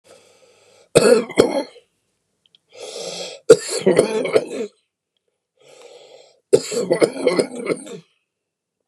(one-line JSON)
{"three_cough_length": "8.9 s", "three_cough_amplitude": 32768, "three_cough_signal_mean_std_ratio": 0.37, "survey_phase": "beta (2021-08-13 to 2022-03-07)", "age": "65+", "gender": "Male", "wearing_mask": "No", "symptom_cough_any": true, "symptom_shortness_of_breath": true, "symptom_onset": "12 days", "smoker_status": "Ex-smoker", "respiratory_condition_asthma": false, "respiratory_condition_other": true, "recruitment_source": "REACT", "submission_delay": "0 days", "covid_test_result": "Negative", "covid_test_method": "RT-qPCR", "influenza_a_test_result": "Negative", "influenza_b_test_result": "Negative"}